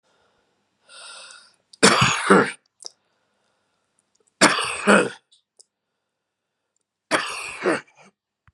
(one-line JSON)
{"three_cough_length": "8.5 s", "three_cough_amplitude": 32646, "three_cough_signal_mean_std_ratio": 0.32, "survey_phase": "beta (2021-08-13 to 2022-03-07)", "age": "65+", "gender": "Female", "wearing_mask": "No", "symptom_loss_of_taste": true, "smoker_status": "Never smoked", "respiratory_condition_asthma": true, "respiratory_condition_other": false, "recruitment_source": "REACT", "submission_delay": "1 day", "covid_test_result": "Negative", "covid_test_method": "RT-qPCR", "influenza_a_test_result": "Negative", "influenza_b_test_result": "Negative"}